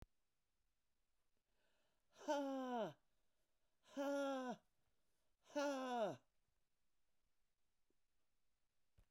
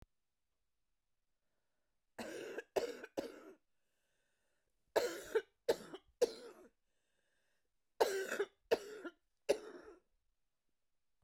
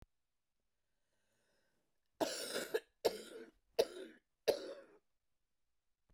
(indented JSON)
{
  "exhalation_length": "9.1 s",
  "exhalation_amplitude": 920,
  "exhalation_signal_mean_std_ratio": 0.42,
  "three_cough_length": "11.2 s",
  "three_cough_amplitude": 4566,
  "three_cough_signal_mean_std_ratio": 0.3,
  "cough_length": "6.1 s",
  "cough_amplitude": 4939,
  "cough_signal_mean_std_ratio": 0.29,
  "survey_phase": "beta (2021-08-13 to 2022-03-07)",
  "age": "45-64",
  "gender": "Female",
  "wearing_mask": "No",
  "symptom_cough_any": true,
  "symptom_runny_or_blocked_nose": true,
  "symptom_shortness_of_breath": true,
  "symptom_sore_throat": true,
  "symptom_onset": "6 days",
  "smoker_status": "Never smoked",
  "respiratory_condition_asthma": false,
  "respiratory_condition_other": false,
  "recruitment_source": "REACT",
  "submission_delay": "1 day",
  "covid_test_result": "Negative",
  "covid_test_method": "RT-qPCR",
  "influenza_a_test_result": "Unknown/Void",
  "influenza_b_test_result": "Unknown/Void"
}